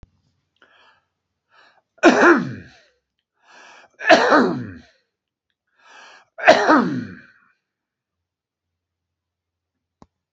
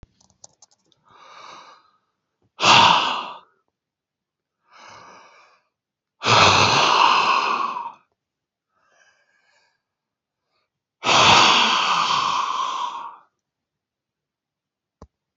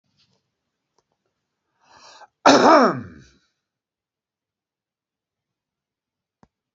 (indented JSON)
{
  "three_cough_length": "10.3 s",
  "three_cough_amplitude": 28952,
  "three_cough_signal_mean_std_ratio": 0.3,
  "exhalation_length": "15.4 s",
  "exhalation_amplitude": 28424,
  "exhalation_signal_mean_std_ratio": 0.41,
  "cough_length": "6.7 s",
  "cough_amplitude": 28571,
  "cough_signal_mean_std_ratio": 0.21,
  "survey_phase": "beta (2021-08-13 to 2022-03-07)",
  "age": "45-64",
  "gender": "Male",
  "wearing_mask": "No",
  "symptom_shortness_of_breath": true,
  "symptom_fatigue": true,
  "smoker_status": "Current smoker (1 to 10 cigarettes per day)",
  "respiratory_condition_asthma": false,
  "respiratory_condition_other": false,
  "recruitment_source": "REACT",
  "submission_delay": "2 days",
  "covid_test_result": "Negative",
  "covid_test_method": "RT-qPCR",
  "influenza_a_test_result": "Negative",
  "influenza_b_test_result": "Negative"
}